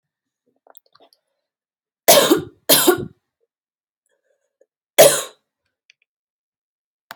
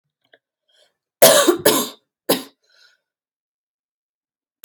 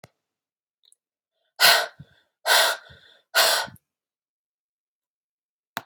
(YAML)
three_cough_length: 7.2 s
three_cough_amplitude: 32768
three_cough_signal_mean_std_ratio: 0.26
cough_length: 4.6 s
cough_amplitude: 32768
cough_signal_mean_std_ratio: 0.28
exhalation_length: 5.9 s
exhalation_amplitude: 23963
exhalation_signal_mean_std_ratio: 0.3
survey_phase: alpha (2021-03-01 to 2021-08-12)
age: 18-44
gender: Female
wearing_mask: 'No'
symptom_headache: true
symptom_loss_of_taste: true
smoker_status: Never smoked
respiratory_condition_asthma: false
respiratory_condition_other: false
recruitment_source: Test and Trace
submission_delay: 1 day
covid_test_result: Positive
covid_test_method: RT-qPCR
covid_ct_value: 28.2
covid_ct_gene: N gene